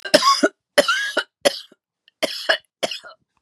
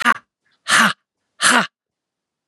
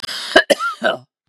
{"three_cough_length": "3.4 s", "three_cough_amplitude": 32767, "three_cough_signal_mean_std_ratio": 0.42, "exhalation_length": "2.5 s", "exhalation_amplitude": 32767, "exhalation_signal_mean_std_ratio": 0.39, "cough_length": "1.3 s", "cough_amplitude": 32768, "cough_signal_mean_std_ratio": 0.48, "survey_phase": "beta (2021-08-13 to 2022-03-07)", "age": "45-64", "gender": "Female", "wearing_mask": "No", "symptom_none": true, "smoker_status": "Prefer not to say", "respiratory_condition_asthma": false, "respiratory_condition_other": false, "recruitment_source": "REACT", "submission_delay": "3 days", "covid_test_result": "Negative", "covid_test_method": "RT-qPCR", "influenza_a_test_result": "Unknown/Void", "influenza_b_test_result": "Unknown/Void"}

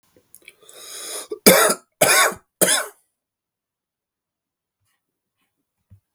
{"three_cough_length": "6.1 s", "three_cough_amplitude": 32768, "three_cough_signal_mean_std_ratio": 0.3, "survey_phase": "beta (2021-08-13 to 2022-03-07)", "age": "45-64", "gender": "Male", "wearing_mask": "No", "symptom_cough_any": true, "symptom_runny_or_blocked_nose": true, "symptom_sore_throat": true, "symptom_headache": true, "smoker_status": "Never smoked", "respiratory_condition_asthma": false, "respiratory_condition_other": false, "recruitment_source": "Test and Trace", "submission_delay": "1 day", "covid_test_result": "Positive", "covid_test_method": "ePCR"}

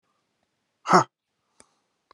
{"exhalation_length": "2.1 s", "exhalation_amplitude": 28467, "exhalation_signal_mean_std_ratio": 0.19, "survey_phase": "alpha (2021-03-01 to 2021-08-12)", "age": "45-64", "gender": "Male", "wearing_mask": "No", "symptom_none": true, "smoker_status": "Ex-smoker", "respiratory_condition_asthma": true, "respiratory_condition_other": false, "recruitment_source": "REACT", "submission_delay": "35 days", "covid_test_result": "Negative", "covid_test_method": "RT-qPCR"}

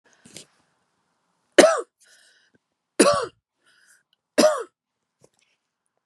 {"three_cough_length": "6.1 s", "three_cough_amplitude": 32757, "three_cough_signal_mean_std_ratio": 0.25, "survey_phase": "beta (2021-08-13 to 2022-03-07)", "age": "45-64", "gender": "Female", "wearing_mask": "No", "symptom_fatigue": true, "smoker_status": "Ex-smoker", "respiratory_condition_asthma": false, "respiratory_condition_other": false, "recruitment_source": "REACT", "submission_delay": "4 days", "covid_test_result": "Negative", "covid_test_method": "RT-qPCR", "influenza_a_test_result": "Unknown/Void", "influenza_b_test_result": "Unknown/Void"}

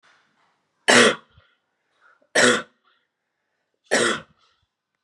{"three_cough_length": "5.0 s", "three_cough_amplitude": 26556, "three_cough_signal_mean_std_ratio": 0.3, "survey_phase": "beta (2021-08-13 to 2022-03-07)", "age": "18-44", "gender": "Female", "wearing_mask": "No", "symptom_new_continuous_cough": true, "symptom_runny_or_blocked_nose": true, "symptom_shortness_of_breath": true, "symptom_sore_throat": true, "symptom_headache": true, "symptom_change_to_sense_of_smell_or_taste": true, "symptom_other": true, "symptom_onset": "5 days", "smoker_status": "Current smoker (e-cigarettes or vapes only)", "respiratory_condition_asthma": false, "respiratory_condition_other": false, "recruitment_source": "Test and Trace", "submission_delay": "2 days", "covid_test_result": "Positive", "covid_test_method": "RT-qPCR", "covid_ct_value": 17.0, "covid_ct_gene": "ORF1ab gene", "covid_ct_mean": 17.3, "covid_viral_load": "2100000 copies/ml", "covid_viral_load_category": "High viral load (>1M copies/ml)"}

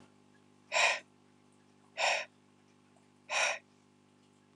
{"exhalation_length": "4.6 s", "exhalation_amplitude": 6490, "exhalation_signal_mean_std_ratio": 0.35, "survey_phase": "alpha (2021-03-01 to 2021-08-12)", "age": "18-44", "gender": "Male", "wearing_mask": "No", "symptom_none": true, "smoker_status": "Never smoked", "respiratory_condition_asthma": false, "respiratory_condition_other": false, "recruitment_source": "REACT", "submission_delay": "3 days", "covid_test_result": "Negative", "covid_test_method": "RT-qPCR"}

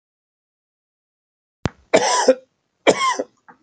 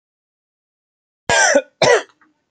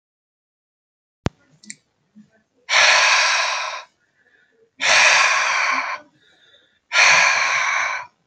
{"three_cough_length": "3.6 s", "three_cough_amplitude": 28447, "three_cough_signal_mean_std_ratio": 0.34, "cough_length": "2.5 s", "cough_amplitude": 29521, "cough_signal_mean_std_ratio": 0.38, "exhalation_length": "8.3 s", "exhalation_amplitude": 30274, "exhalation_signal_mean_std_ratio": 0.53, "survey_phase": "beta (2021-08-13 to 2022-03-07)", "age": "45-64", "gender": "Male", "wearing_mask": "No", "symptom_none": true, "smoker_status": "Ex-smoker", "respiratory_condition_asthma": false, "respiratory_condition_other": false, "recruitment_source": "REACT", "submission_delay": "3 days", "covid_test_result": "Negative", "covid_test_method": "RT-qPCR", "influenza_a_test_result": "Negative", "influenza_b_test_result": "Negative"}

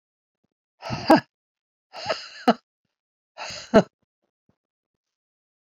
{"exhalation_length": "5.6 s", "exhalation_amplitude": 27472, "exhalation_signal_mean_std_ratio": 0.22, "survey_phase": "beta (2021-08-13 to 2022-03-07)", "age": "45-64", "gender": "Female", "wearing_mask": "No", "symptom_cough_any": true, "symptom_runny_or_blocked_nose": true, "symptom_headache": true, "symptom_onset": "4 days", "smoker_status": "Ex-smoker", "respiratory_condition_asthma": false, "respiratory_condition_other": false, "recruitment_source": "Test and Trace", "submission_delay": "1 day", "covid_test_result": "Positive", "covid_test_method": "RT-qPCR", "covid_ct_value": 23.1, "covid_ct_gene": "ORF1ab gene"}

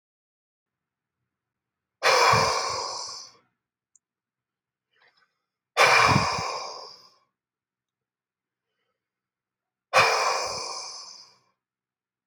{"exhalation_length": "12.3 s", "exhalation_amplitude": 18195, "exhalation_signal_mean_std_ratio": 0.36, "survey_phase": "alpha (2021-03-01 to 2021-08-12)", "age": "18-44", "gender": "Male", "wearing_mask": "No", "symptom_cough_any": true, "smoker_status": "Ex-smoker", "respiratory_condition_asthma": false, "respiratory_condition_other": false, "recruitment_source": "REACT", "submission_delay": "2 days", "covid_test_result": "Negative", "covid_test_method": "RT-qPCR"}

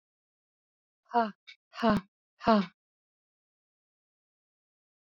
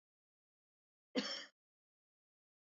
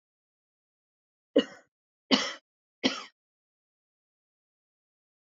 {"exhalation_length": "5.0 s", "exhalation_amplitude": 10200, "exhalation_signal_mean_std_ratio": 0.25, "cough_length": "2.6 s", "cough_amplitude": 1983, "cough_signal_mean_std_ratio": 0.23, "three_cough_length": "5.2 s", "three_cough_amplitude": 15298, "three_cough_signal_mean_std_ratio": 0.19, "survey_phase": "beta (2021-08-13 to 2022-03-07)", "age": "45-64", "gender": "Female", "wearing_mask": "No", "symptom_none": true, "symptom_onset": "12 days", "smoker_status": "Never smoked", "respiratory_condition_asthma": false, "respiratory_condition_other": false, "recruitment_source": "REACT", "submission_delay": "9 days", "covid_test_result": "Negative", "covid_test_method": "RT-qPCR", "influenza_a_test_result": "Negative", "influenza_b_test_result": "Negative"}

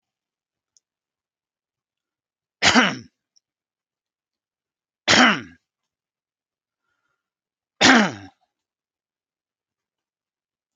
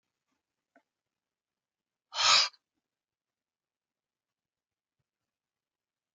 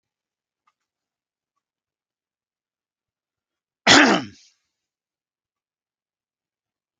{"three_cough_length": "10.8 s", "three_cough_amplitude": 32712, "three_cough_signal_mean_std_ratio": 0.22, "exhalation_length": "6.1 s", "exhalation_amplitude": 10705, "exhalation_signal_mean_std_ratio": 0.17, "cough_length": "7.0 s", "cough_amplitude": 32768, "cough_signal_mean_std_ratio": 0.17, "survey_phase": "alpha (2021-03-01 to 2021-08-12)", "age": "45-64", "gender": "Male", "wearing_mask": "No", "symptom_none": true, "smoker_status": "Never smoked", "respiratory_condition_asthma": false, "respiratory_condition_other": false, "recruitment_source": "REACT", "submission_delay": "1 day", "covid_test_result": "Negative", "covid_test_method": "RT-qPCR"}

